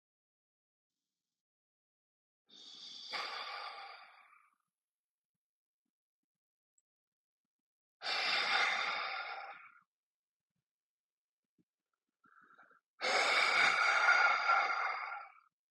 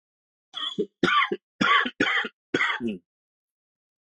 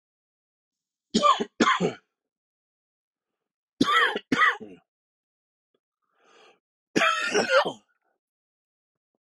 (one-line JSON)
{"exhalation_length": "15.7 s", "exhalation_amplitude": 4725, "exhalation_signal_mean_std_ratio": 0.41, "cough_length": "4.1 s", "cough_amplitude": 13897, "cough_signal_mean_std_ratio": 0.48, "three_cough_length": "9.2 s", "three_cough_amplitude": 16423, "three_cough_signal_mean_std_ratio": 0.35, "survey_phase": "beta (2021-08-13 to 2022-03-07)", "age": "45-64", "gender": "Male", "wearing_mask": "No", "symptom_fatigue": true, "smoker_status": "Never smoked", "respiratory_condition_asthma": false, "respiratory_condition_other": false, "recruitment_source": "REACT", "submission_delay": "1 day", "covid_test_result": "Negative", "covid_test_method": "RT-qPCR", "influenza_a_test_result": "Negative", "influenza_b_test_result": "Negative"}